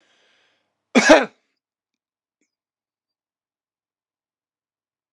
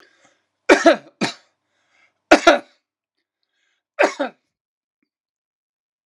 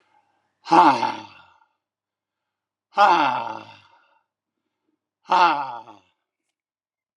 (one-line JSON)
{"cough_length": "5.1 s", "cough_amplitude": 32768, "cough_signal_mean_std_ratio": 0.17, "three_cough_length": "6.1 s", "three_cough_amplitude": 32768, "three_cough_signal_mean_std_ratio": 0.24, "exhalation_length": "7.2 s", "exhalation_amplitude": 27270, "exhalation_signal_mean_std_ratio": 0.33, "survey_phase": "alpha (2021-03-01 to 2021-08-12)", "age": "65+", "gender": "Male", "wearing_mask": "No", "symptom_cough_any": true, "symptom_fatigue": true, "symptom_onset": "10 days", "smoker_status": "Never smoked", "respiratory_condition_asthma": true, "respiratory_condition_other": false, "recruitment_source": "Test and Trace", "submission_delay": "2 days", "covid_test_result": "Positive", "covid_test_method": "RT-qPCR", "covid_ct_value": 20.8, "covid_ct_gene": "ORF1ab gene", "covid_ct_mean": 21.5, "covid_viral_load": "89000 copies/ml", "covid_viral_load_category": "Low viral load (10K-1M copies/ml)"}